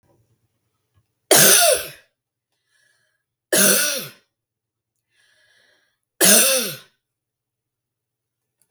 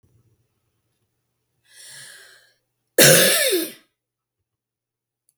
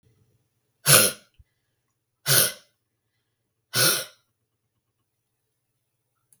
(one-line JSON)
{"three_cough_length": "8.7 s", "three_cough_amplitude": 32768, "three_cough_signal_mean_std_ratio": 0.33, "cough_length": "5.4 s", "cough_amplitude": 32768, "cough_signal_mean_std_ratio": 0.28, "exhalation_length": "6.4 s", "exhalation_amplitude": 32766, "exhalation_signal_mean_std_ratio": 0.26, "survey_phase": "beta (2021-08-13 to 2022-03-07)", "age": "65+", "gender": "Female", "wearing_mask": "No", "symptom_none": true, "smoker_status": "Ex-smoker", "respiratory_condition_asthma": false, "respiratory_condition_other": false, "recruitment_source": "REACT", "submission_delay": "1 day", "covid_test_result": "Negative", "covid_test_method": "RT-qPCR"}